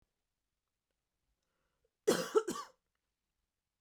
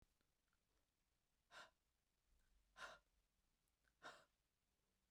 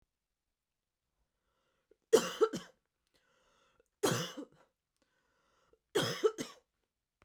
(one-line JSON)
{"cough_length": "3.8 s", "cough_amplitude": 4475, "cough_signal_mean_std_ratio": 0.23, "exhalation_length": "5.1 s", "exhalation_amplitude": 182, "exhalation_signal_mean_std_ratio": 0.34, "three_cough_length": "7.2 s", "three_cough_amplitude": 7407, "three_cough_signal_mean_std_ratio": 0.26, "survey_phase": "beta (2021-08-13 to 2022-03-07)", "age": "18-44", "gender": "Female", "wearing_mask": "No", "symptom_none": true, "symptom_onset": "7 days", "smoker_status": "Never smoked", "respiratory_condition_asthma": false, "respiratory_condition_other": false, "recruitment_source": "REACT", "submission_delay": "2 days", "covid_test_result": "Negative", "covid_test_method": "RT-qPCR", "influenza_a_test_result": "Unknown/Void", "influenza_b_test_result": "Unknown/Void"}